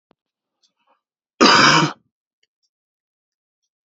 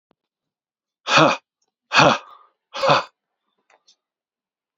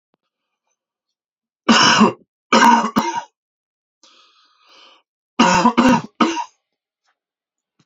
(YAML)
cough_length: 3.8 s
cough_amplitude: 30681
cough_signal_mean_std_ratio: 0.29
exhalation_length: 4.8 s
exhalation_amplitude: 28491
exhalation_signal_mean_std_ratio: 0.31
three_cough_length: 7.9 s
three_cough_amplitude: 31301
three_cough_signal_mean_std_ratio: 0.38
survey_phase: beta (2021-08-13 to 2022-03-07)
age: 18-44
gender: Male
wearing_mask: 'No'
symptom_cough_any: true
symptom_runny_or_blocked_nose: true
symptom_fatigue: true
symptom_fever_high_temperature: true
symptom_change_to_sense_of_smell_or_taste: true
symptom_onset: 4 days
smoker_status: Ex-smoker
respiratory_condition_asthma: false
respiratory_condition_other: false
recruitment_source: Test and Trace
submission_delay: 2 days
covid_test_result: Positive
covid_test_method: RT-qPCR
covid_ct_value: 17.7
covid_ct_gene: ORF1ab gene